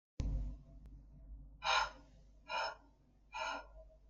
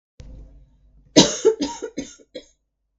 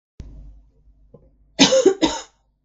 exhalation_length: 4.1 s
exhalation_amplitude: 2843
exhalation_signal_mean_std_ratio: 0.53
three_cough_length: 3.0 s
three_cough_amplitude: 32768
three_cough_signal_mean_std_ratio: 0.31
cough_length: 2.6 s
cough_amplitude: 32766
cough_signal_mean_std_ratio: 0.35
survey_phase: beta (2021-08-13 to 2022-03-07)
age: 18-44
gender: Female
wearing_mask: 'No'
symptom_none: true
symptom_onset: 9 days
smoker_status: Never smoked
respiratory_condition_asthma: false
respiratory_condition_other: false
recruitment_source: REACT
submission_delay: 12 days
covid_test_result: Negative
covid_test_method: RT-qPCR
influenza_a_test_result: Negative
influenza_b_test_result: Negative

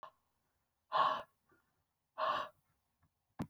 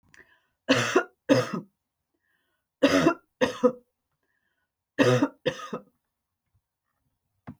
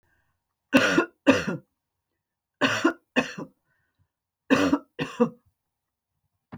exhalation_length: 3.5 s
exhalation_amplitude: 3536
exhalation_signal_mean_std_ratio: 0.34
cough_length: 7.6 s
cough_amplitude: 16574
cough_signal_mean_std_ratio: 0.34
three_cough_length: 6.6 s
three_cough_amplitude: 20997
three_cough_signal_mean_std_ratio: 0.35
survey_phase: beta (2021-08-13 to 2022-03-07)
age: 45-64
gender: Female
wearing_mask: 'No'
symptom_none: true
smoker_status: Never smoked
respiratory_condition_asthma: false
respiratory_condition_other: false
recruitment_source: REACT
submission_delay: 2 days
covid_test_result: Negative
covid_test_method: RT-qPCR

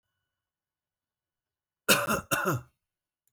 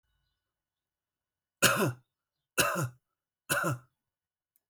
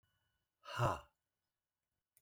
cough_length: 3.3 s
cough_amplitude: 15719
cough_signal_mean_std_ratio: 0.31
three_cough_length: 4.7 s
three_cough_amplitude: 13194
three_cough_signal_mean_std_ratio: 0.33
exhalation_length: 2.2 s
exhalation_amplitude: 2665
exhalation_signal_mean_std_ratio: 0.27
survey_phase: alpha (2021-03-01 to 2021-08-12)
age: 45-64
gender: Male
wearing_mask: 'No'
symptom_none: true
smoker_status: Never smoked
respiratory_condition_asthma: false
respiratory_condition_other: false
recruitment_source: REACT
submission_delay: 3 days
covid_test_result: Negative
covid_test_method: RT-qPCR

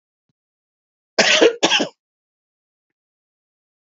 cough_length: 3.8 s
cough_amplitude: 29561
cough_signal_mean_std_ratio: 0.29
survey_phase: beta (2021-08-13 to 2022-03-07)
age: 65+
gender: Male
wearing_mask: 'No'
symptom_cough_any: true
symptom_runny_or_blocked_nose: true
symptom_sore_throat: true
symptom_other: true
smoker_status: Never smoked
respiratory_condition_asthma: false
respiratory_condition_other: false
recruitment_source: Test and Trace
submission_delay: 3 days
covid_test_result: Positive
covid_test_method: RT-qPCR
covid_ct_value: 27.1
covid_ct_gene: ORF1ab gene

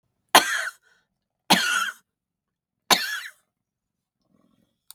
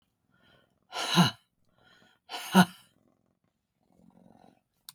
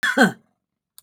three_cough_length: 4.9 s
three_cough_amplitude: 32768
three_cough_signal_mean_std_ratio: 0.29
exhalation_length: 4.9 s
exhalation_amplitude: 14233
exhalation_signal_mean_std_ratio: 0.23
cough_length: 1.0 s
cough_amplitude: 30253
cough_signal_mean_std_ratio: 0.39
survey_phase: beta (2021-08-13 to 2022-03-07)
age: 65+
gender: Female
wearing_mask: 'No'
symptom_none: true
smoker_status: Ex-smoker
respiratory_condition_asthma: false
respiratory_condition_other: false
recruitment_source: REACT
submission_delay: 2 days
covid_test_result: Negative
covid_test_method: RT-qPCR
influenza_a_test_result: Negative
influenza_b_test_result: Negative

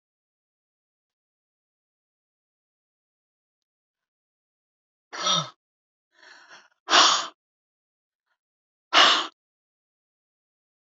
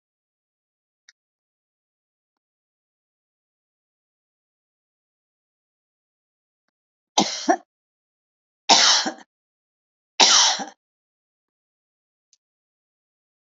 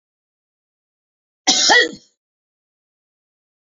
exhalation_length: 10.8 s
exhalation_amplitude: 24521
exhalation_signal_mean_std_ratio: 0.22
three_cough_length: 13.6 s
three_cough_amplitude: 32768
three_cough_signal_mean_std_ratio: 0.21
cough_length: 3.7 s
cough_amplitude: 29296
cough_signal_mean_std_ratio: 0.27
survey_phase: beta (2021-08-13 to 2022-03-07)
age: 65+
gender: Female
wearing_mask: 'No'
symptom_none: true
smoker_status: Ex-smoker
respiratory_condition_asthma: false
respiratory_condition_other: false
recruitment_source: REACT
submission_delay: 2 days
covid_test_result: Negative
covid_test_method: RT-qPCR
influenza_a_test_result: Negative
influenza_b_test_result: Negative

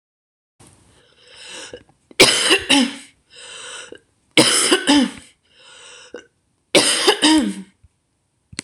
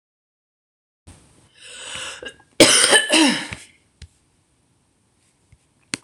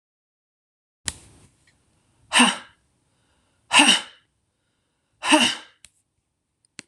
three_cough_length: 8.6 s
three_cough_amplitude: 26028
three_cough_signal_mean_std_ratio: 0.41
cough_length: 6.0 s
cough_amplitude: 26028
cough_signal_mean_std_ratio: 0.31
exhalation_length: 6.9 s
exhalation_amplitude: 26027
exhalation_signal_mean_std_ratio: 0.27
survey_phase: beta (2021-08-13 to 2022-03-07)
age: 45-64
gender: Female
wearing_mask: 'No'
symptom_cough_any: true
symptom_new_continuous_cough: true
symptom_runny_or_blocked_nose: true
symptom_fatigue: true
symptom_fever_high_temperature: true
symptom_headache: true
symptom_onset: 3 days
smoker_status: Never smoked
respiratory_condition_asthma: false
respiratory_condition_other: false
recruitment_source: Test and Trace
submission_delay: 2 days
covid_test_result: Positive
covid_test_method: RT-qPCR
covid_ct_value: 21.5
covid_ct_gene: N gene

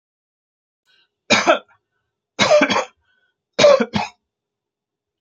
three_cough_length: 5.2 s
three_cough_amplitude: 29724
three_cough_signal_mean_std_ratio: 0.35
survey_phase: beta (2021-08-13 to 2022-03-07)
age: 65+
gender: Female
wearing_mask: 'No'
symptom_none: true
smoker_status: Never smoked
respiratory_condition_asthma: false
respiratory_condition_other: false
recruitment_source: REACT
submission_delay: 3 days
covid_test_result: Negative
covid_test_method: RT-qPCR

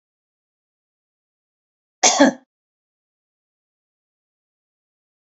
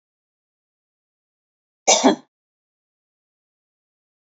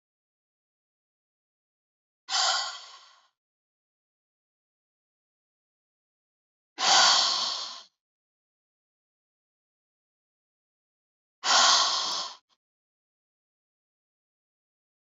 cough_length: 5.4 s
cough_amplitude: 32767
cough_signal_mean_std_ratio: 0.17
three_cough_length: 4.3 s
three_cough_amplitude: 30122
three_cough_signal_mean_std_ratio: 0.18
exhalation_length: 15.1 s
exhalation_amplitude: 18523
exhalation_signal_mean_std_ratio: 0.28
survey_phase: beta (2021-08-13 to 2022-03-07)
age: 65+
gender: Female
wearing_mask: 'No'
symptom_none: true
symptom_onset: 7 days
smoker_status: Never smoked
respiratory_condition_asthma: false
respiratory_condition_other: false
recruitment_source: REACT
submission_delay: 1 day
covid_test_result: Negative
covid_test_method: RT-qPCR
influenza_a_test_result: Negative
influenza_b_test_result: Negative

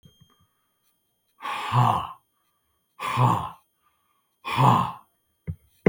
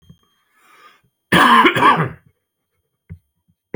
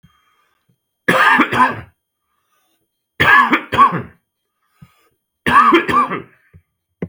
exhalation_length: 5.9 s
exhalation_amplitude: 27238
exhalation_signal_mean_std_ratio: 0.38
cough_length: 3.8 s
cough_amplitude: 32768
cough_signal_mean_std_ratio: 0.37
three_cough_length: 7.1 s
three_cough_amplitude: 32768
three_cough_signal_mean_std_ratio: 0.43
survey_phase: beta (2021-08-13 to 2022-03-07)
age: 45-64
gender: Male
wearing_mask: 'No'
symptom_none: true
smoker_status: Ex-smoker
respiratory_condition_asthma: false
respiratory_condition_other: false
recruitment_source: REACT
submission_delay: 1 day
covid_test_result: Negative
covid_test_method: RT-qPCR
influenza_a_test_result: Negative
influenza_b_test_result: Negative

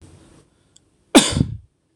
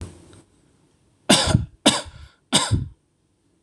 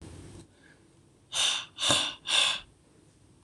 cough_length: 2.0 s
cough_amplitude: 26028
cough_signal_mean_std_ratio: 0.28
three_cough_length: 3.6 s
three_cough_amplitude: 26027
three_cough_signal_mean_std_ratio: 0.37
exhalation_length: 3.4 s
exhalation_amplitude: 12396
exhalation_signal_mean_std_ratio: 0.47
survey_phase: beta (2021-08-13 to 2022-03-07)
age: 18-44
gender: Male
wearing_mask: 'No'
symptom_none: true
smoker_status: Never smoked
respiratory_condition_asthma: false
respiratory_condition_other: false
recruitment_source: REACT
submission_delay: 1 day
covid_test_result: Negative
covid_test_method: RT-qPCR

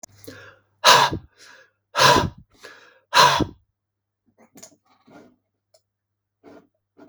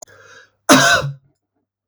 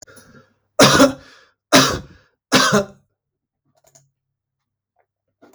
exhalation_length: 7.1 s
exhalation_amplitude: 32768
exhalation_signal_mean_std_ratio: 0.29
cough_length: 1.9 s
cough_amplitude: 32768
cough_signal_mean_std_ratio: 0.38
three_cough_length: 5.5 s
three_cough_amplitude: 32768
three_cough_signal_mean_std_ratio: 0.32
survey_phase: beta (2021-08-13 to 2022-03-07)
age: 45-64
gender: Male
wearing_mask: 'No'
symptom_none: true
smoker_status: Never smoked
respiratory_condition_asthma: false
respiratory_condition_other: false
recruitment_source: REACT
submission_delay: 1 day
covid_test_result: Negative
covid_test_method: RT-qPCR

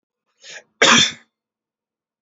cough_length: 2.2 s
cough_amplitude: 31332
cough_signal_mean_std_ratio: 0.3
survey_phase: beta (2021-08-13 to 2022-03-07)
age: 18-44
gender: Male
wearing_mask: 'No'
symptom_none: true
smoker_status: Never smoked
respiratory_condition_asthma: false
respiratory_condition_other: false
recruitment_source: REACT
submission_delay: 1 day
covid_test_result: Negative
covid_test_method: RT-qPCR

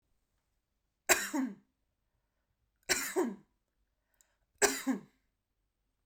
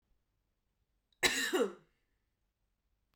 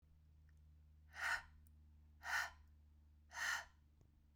three_cough_length: 6.1 s
three_cough_amplitude: 10993
three_cough_signal_mean_std_ratio: 0.31
cough_length: 3.2 s
cough_amplitude: 6812
cough_signal_mean_std_ratio: 0.3
exhalation_length: 4.4 s
exhalation_amplitude: 1169
exhalation_signal_mean_std_ratio: 0.45
survey_phase: beta (2021-08-13 to 2022-03-07)
age: 18-44
gender: Female
wearing_mask: 'No'
symptom_none: true
smoker_status: Never smoked
respiratory_condition_asthma: false
respiratory_condition_other: false
recruitment_source: REACT
submission_delay: 0 days
covid_test_result: Negative
covid_test_method: RT-qPCR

